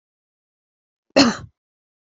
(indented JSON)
{
  "cough_length": "2.0 s",
  "cough_amplitude": 29260,
  "cough_signal_mean_std_ratio": 0.23,
  "survey_phase": "beta (2021-08-13 to 2022-03-07)",
  "age": "45-64",
  "gender": "Female",
  "wearing_mask": "No",
  "symptom_none": true,
  "smoker_status": "Never smoked",
  "respiratory_condition_asthma": true,
  "respiratory_condition_other": false,
  "recruitment_source": "REACT",
  "submission_delay": "9 days",
  "covid_test_result": "Negative",
  "covid_test_method": "RT-qPCR",
  "influenza_a_test_result": "Negative",
  "influenza_b_test_result": "Negative"
}